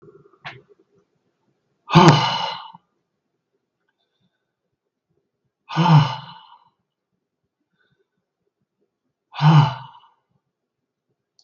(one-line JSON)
{"exhalation_length": "11.4 s", "exhalation_amplitude": 32768, "exhalation_signal_mean_std_ratio": 0.26, "survey_phase": "beta (2021-08-13 to 2022-03-07)", "age": "65+", "gender": "Male", "wearing_mask": "No", "symptom_none": true, "smoker_status": "Never smoked", "respiratory_condition_asthma": true, "respiratory_condition_other": false, "recruitment_source": "REACT", "submission_delay": "2 days", "covid_test_result": "Negative", "covid_test_method": "RT-qPCR", "influenza_a_test_result": "Negative", "influenza_b_test_result": "Negative"}